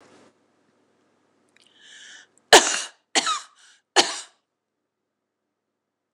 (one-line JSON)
{"three_cough_length": "6.1 s", "three_cough_amplitude": 26028, "three_cough_signal_mean_std_ratio": 0.21, "survey_phase": "beta (2021-08-13 to 2022-03-07)", "age": "65+", "gender": "Female", "wearing_mask": "No", "symptom_headache": true, "symptom_onset": "8 days", "smoker_status": "Never smoked", "respiratory_condition_asthma": false, "respiratory_condition_other": false, "recruitment_source": "REACT", "submission_delay": "0 days", "covid_test_result": "Negative", "covid_test_method": "RT-qPCR", "influenza_a_test_result": "Negative", "influenza_b_test_result": "Negative"}